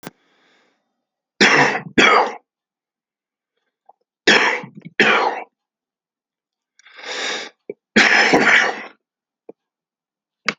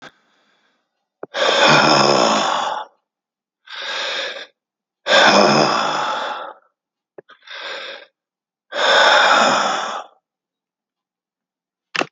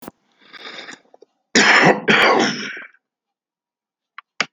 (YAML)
three_cough_length: 10.6 s
three_cough_amplitude: 32767
three_cough_signal_mean_std_ratio: 0.39
exhalation_length: 12.1 s
exhalation_amplitude: 30620
exhalation_signal_mean_std_ratio: 0.51
cough_length: 4.5 s
cough_amplitude: 32767
cough_signal_mean_std_ratio: 0.41
survey_phase: beta (2021-08-13 to 2022-03-07)
age: 65+
gender: Male
wearing_mask: 'No'
symptom_none: true
smoker_status: Current smoker (11 or more cigarettes per day)
respiratory_condition_asthma: false
respiratory_condition_other: false
recruitment_source: REACT
submission_delay: 2 days
covid_test_result: Negative
covid_test_method: RT-qPCR